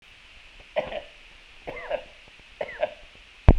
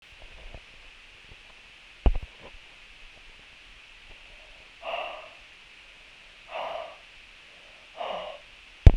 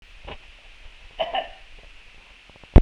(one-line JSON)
{"three_cough_length": "3.6 s", "three_cough_amplitude": 32767, "three_cough_signal_mean_std_ratio": 0.26, "exhalation_length": "9.0 s", "exhalation_amplitude": 32767, "exhalation_signal_mean_std_ratio": 0.21, "cough_length": "2.8 s", "cough_amplitude": 32767, "cough_signal_mean_std_ratio": 0.22, "survey_phase": "beta (2021-08-13 to 2022-03-07)", "age": "45-64", "gender": "Male", "wearing_mask": "No", "symptom_none": true, "smoker_status": "Ex-smoker", "respiratory_condition_asthma": false, "respiratory_condition_other": false, "recruitment_source": "REACT", "submission_delay": "1 day", "covid_test_result": "Negative", "covid_test_method": "RT-qPCR", "influenza_a_test_result": "Unknown/Void", "influenza_b_test_result": "Unknown/Void"}